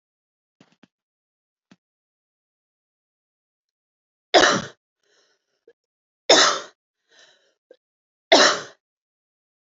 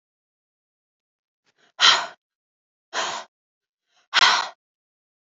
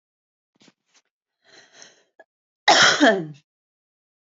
{"three_cough_length": "9.6 s", "three_cough_amplitude": 27813, "three_cough_signal_mean_std_ratio": 0.22, "exhalation_length": "5.4 s", "exhalation_amplitude": 27615, "exhalation_signal_mean_std_ratio": 0.27, "cough_length": "4.3 s", "cough_amplitude": 24834, "cough_signal_mean_std_ratio": 0.28, "survey_phase": "alpha (2021-03-01 to 2021-08-12)", "age": "18-44", "gender": "Female", "wearing_mask": "No", "symptom_abdominal_pain": true, "symptom_fatigue": true, "symptom_headache": true, "smoker_status": "Never smoked", "respiratory_condition_asthma": false, "respiratory_condition_other": false, "recruitment_source": "Test and Trace", "submission_delay": "1 day", "covid_test_result": "Positive", "covid_test_method": "RT-qPCR", "covid_ct_value": 35.7, "covid_ct_gene": "ORF1ab gene"}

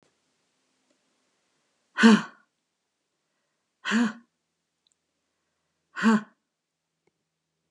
{"exhalation_length": "7.7 s", "exhalation_amplitude": 19408, "exhalation_signal_mean_std_ratio": 0.22, "survey_phase": "beta (2021-08-13 to 2022-03-07)", "age": "65+", "gender": "Female", "wearing_mask": "No", "symptom_none": true, "smoker_status": "Never smoked", "respiratory_condition_asthma": false, "respiratory_condition_other": false, "recruitment_source": "Test and Trace", "submission_delay": "-1 day", "covid_test_result": "Negative", "covid_test_method": "LFT"}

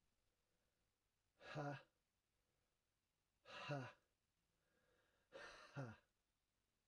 {"exhalation_length": "6.9 s", "exhalation_amplitude": 454, "exhalation_signal_mean_std_ratio": 0.35, "survey_phase": "alpha (2021-03-01 to 2021-08-12)", "age": "45-64", "gender": "Male", "wearing_mask": "No", "symptom_cough_any": true, "symptom_fatigue": true, "symptom_headache": true, "symptom_change_to_sense_of_smell_or_taste": true, "symptom_loss_of_taste": true, "symptom_onset": "3 days", "smoker_status": "Never smoked", "respiratory_condition_asthma": false, "respiratory_condition_other": false, "recruitment_source": "Test and Trace", "submission_delay": "2 days", "covid_test_result": "Positive", "covid_test_method": "RT-qPCR", "covid_ct_value": 16.7, "covid_ct_gene": "ORF1ab gene"}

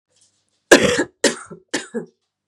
{"cough_length": "2.5 s", "cough_amplitude": 32768, "cough_signal_mean_std_ratio": 0.33, "survey_phase": "beta (2021-08-13 to 2022-03-07)", "age": "18-44", "gender": "Female", "wearing_mask": "No", "symptom_cough_any": true, "symptom_new_continuous_cough": true, "symptom_runny_or_blocked_nose": true, "symptom_shortness_of_breath": true, "symptom_sore_throat": true, "symptom_fatigue": true, "symptom_change_to_sense_of_smell_or_taste": true, "symptom_loss_of_taste": true, "symptom_other": true, "symptom_onset": "4 days", "smoker_status": "Ex-smoker", "respiratory_condition_asthma": false, "respiratory_condition_other": false, "recruitment_source": "Test and Trace", "submission_delay": "2 days", "covid_test_result": "Positive", "covid_test_method": "RT-qPCR", "covid_ct_value": 21.4, "covid_ct_gene": "ORF1ab gene"}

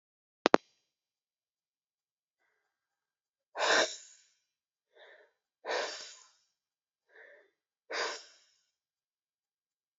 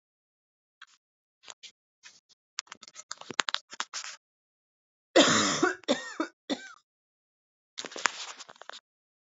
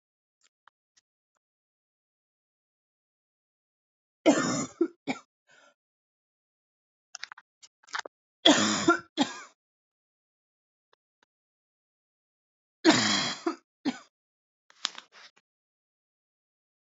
{"exhalation_length": "10.0 s", "exhalation_amplitude": 27942, "exhalation_signal_mean_std_ratio": 0.2, "cough_length": "9.2 s", "cough_amplitude": 26797, "cough_signal_mean_std_ratio": 0.26, "three_cough_length": "17.0 s", "three_cough_amplitude": 20475, "three_cough_signal_mean_std_ratio": 0.24, "survey_phase": "alpha (2021-03-01 to 2021-08-12)", "age": "18-44", "gender": "Female", "wearing_mask": "No", "symptom_cough_any": true, "symptom_new_continuous_cough": true, "symptom_shortness_of_breath": true, "symptom_fatigue": true, "symptom_fever_high_temperature": true, "symptom_change_to_sense_of_smell_or_taste": true, "symptom_loss_of_taste": true, "symptom_onset": "4 days", "smoker_status": "Never smoked", "respiratory_condition_asthma": false, "respiratory_condition_other": false, "recruitment_source": "Test and Trace", "submission_delay": "3 days", "covid_test_result": "Positive", "covid_test_method": "RT-qPCR", "covid_ct_value": 16.5, "covid_ct_gene": "ORF1ab gene", "covid_ct_mean": 17.8, "covid_viral_load": "1500000 copies/ml", "covid_viral_load_category": "High viral load (>1M copies/ml)"}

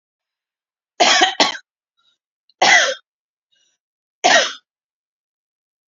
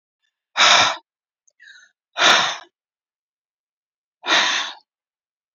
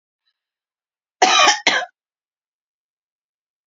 {"three_cough_length": "5.9 s", "three_cough_amplitude": 30421, "three_cough_signal_mean_std_ratio": 0.33, "exhalation_length": "5.5 s", "exhalation_amplitude": 30135, "exhalation_signal_mean_std_ratio": 0.36, "cough_length": "3.7 s", "cough_amplitude": 31399, "cough_signal_mean_std_ratio": 0.29, "survey_phase": "beta (2021-08-13 to 2022-03-07)", "age": "45-64", "gender": "Female", "wearing_mask": "No", "symptom_none": true, "smoker_status": "Ex-smoker", "respiratory_condition_asthma": false, "respiratory_condition_other": false, "recruitment_source": "REACT", "submission_delay": "4 days", "covid_test_result": "Negative", "covid_test_method": "RT-qPCR", "influenza_a_test_result": "Unknown/Void", "influenza_b_test_result": "Unknown/Void"}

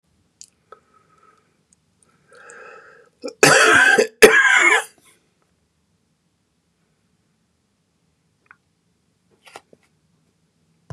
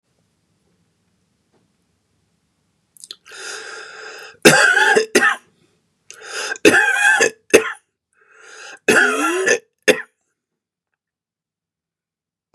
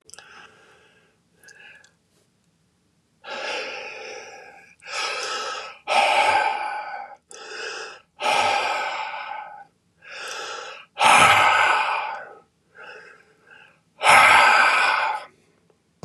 {"cough_length": "10.9 s", "cough_amplitude": 32768, "cough_signal_mean_std_ratio": 0.28, "three_cough_length": "12.5 s", "three_cough_amplitude": 32768, "three_cough_signal_mean_std_ratio": 0.37, "exhalation_length": "16.0 s", "exhalation_amplitude": 29316, "exhalation_signal_mean_std_ratio": 0.48, "survey_phase": "beta (2021-08-13 to 2022-03-07)", "age": "65+", "gender": "Male", "wearing_mask": "No", "symptom_none": true, "smoker_status": "Never smoked", "respiratory_condition_asthma": false, "respiratory_condition_other": false, "recruitment_source": "REACT", "submission_delay": "1 day", "covid_test_result": "Negative", "covid_test_method": "RT-qPCR", "influenza_a_test_result": "Negative", "influenza_b_test_result": "Negative"}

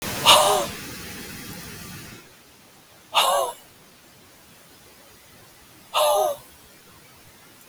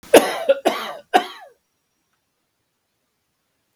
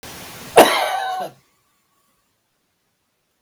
{"exhalation_length": "7.7 s", "exhalation_amplitude": 32768, "exhalation_signal_mean_std_ratio": 0.4, "three_cough_length": "3.8 s", "three_cough_amplitude": 32768, "three_cough_signal_mean_std_ratio": 0.27, "cough_length": "3.4 s", "cough_amplitude": 32768, "cough_signal_mean_std_ratio": 0.3, "survey_phase": "beta (2021-08-13 to 2022-03-07)", "age": "45-64", "gender": "Male", "wearing_mask": "No", "symptom_runny_or_blocked_nose": true, "symptom_headache": true, "smoker_status": "Never smoked", "respiratory_condition_asthma": false, "respiratory_condition_other": false, "recruitment_source": "REACT", "submission_delay": "1 day", "covid_test_result": "Negative", "covid_test_method": "RT-qPCR", "influenza_a_test_result": "Negative", "influenza_b_test_result": "Negative"}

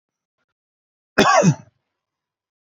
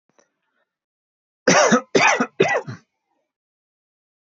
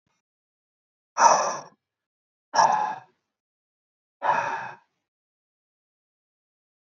{"cough_length": "2.7 s", "cough_amplitude": 26145, "cough_signal_mean_std_ratio": 0.3, "three_cough_length": "4.4 s", "three_cough_amplitude": 26127, "three_cough_signal_mean_std_ratio": 0.35, "exhalation_length": "6.8 s", "exhalation_amplitude": 21525, "exhalation_signal_mean_std_ratio": 0.3, "survey_phase": "beta (2021-08-13 to 2022-03-07)", "age": "18-44", "gender": "Male", "wearing_mask": "No", "symptom_none": true, "smoker_status": "Never smoked", "respiratory_condition_asthma": false, "respiratory_condition_other": false, "recruitment_source": "REACT", "submission_delay": "2 days", "covid_test_result": "Negative", "covid_test_method": "RT-qPCR", "influenza_a_test_result": "Negative", "influenza_b_test_result": "Negative"}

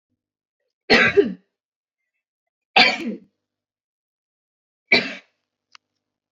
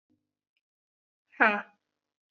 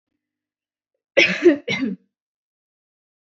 {"three_cough_length": "6.3 s", "three_cough_amplitude": 29093, "three_cough_signal_mean_std_ratio": 0.27, "exhalation_length": "2.3 s", "exhalation_amplitude": 15913, "exhalation_signal_mean_std_ratio": 0.2, "cough_length": "3.2 s", "cough_amplitude": 26560, "cough_signal_mean_std_ratio": 0.3, "survey_phase": "beta (2021-08-13 to 2022-03-07)", "age": "18-44", "gender": "Female", "wearing_mask": "No", "symptom_cough_any": true, "symptom_runny_or_blocked_nose": true, "symptom_sore_throat": true, "symptom_abdominal_pain": true, "symptom_diarrhoea": true, "symptom_fatigue": true, "symptom_fever_high_temperature": true, "symptom_headache": true, "symptom_onset": "3 days", "smoker_status": "Never smoked", "respiratory_condition_asthma": false, "respiratory_condition_other": false, "recruitment_source": "Test and Trace", "submission_delay": "1 day", "covid_test_result": "Positive", "covid_test_method": "RT-qPCR", "covid_ct_value": 26.9, "covid_ct_gene": "ORF1ab gene", "covid_ct_mean": 27.6, "covid_viral_load": "870 copies/ml", "covid_viral_load_category": "Minimal viral load (< 10K copies/ml)"}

